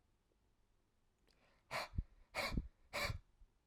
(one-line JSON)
{"exhalation_length": "3.7 s", "exhalation_amplitude": 1667, "exhalation_signal_mean_std_ratio": 0.4, "survey_phase": "alpha (2021-03-01 to 2021-08-12)", "age": "18-44", "gender": "Male", "wearing_mask": "No", "symptom_none": true, "symptom_onset": "13 days", "smoker_status": "Never smoked", "respiratory_condition_asthma": false, "respiratory_condition_other": false, "recruitment_source": "REACT", "submission_delay": "2 days", "covid_test_result": "Negative", "covid_test_method": "RT-qPCR"}